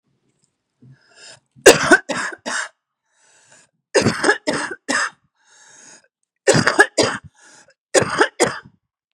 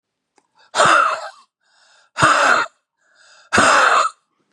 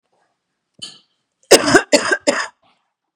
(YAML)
three_cough_length: 9.1 s
three_cough_amplitude: 32768
three_cough_signal_mean_std_ratio: 0.35
exhalation_length: 4.5 s
exhalation_amplitude: 32768
exhalation_signal_mean_std_ratio: 0.5
cough_length: 3.2 s
cough_amplitude: 32768
cough_signal_mean_std_ratio: 0.33
survey_phase: beta (2021-08-13 to 2022-03-07)
age: 45-64
gender: Female
wearing_mask: 'No'
symptom_cough_any: true
symptom_runny_or_blocked_nose: true
symptom_shortness_of_breath: true
symptom_sore_throat: true
symptom_abdominal_pain: true
symptom_onset: 2 days
smoker_status: Ex-smoker
respiratory_condition_asthma: true
respiratory_condition_other: false
recruitment_source: Test and Trace
submission_delay: 1 day
covid_test_result: Positive
covid_test_method: RT-qPCR
covid_ct_value: 26.0
covid_ct_gene: ORF1ab gene
covid_ct_mean: 27.1
covid_viral_load: 1300 copies/ml
covid_viral_load_category: Minimal viral load (< 10K copies/ml)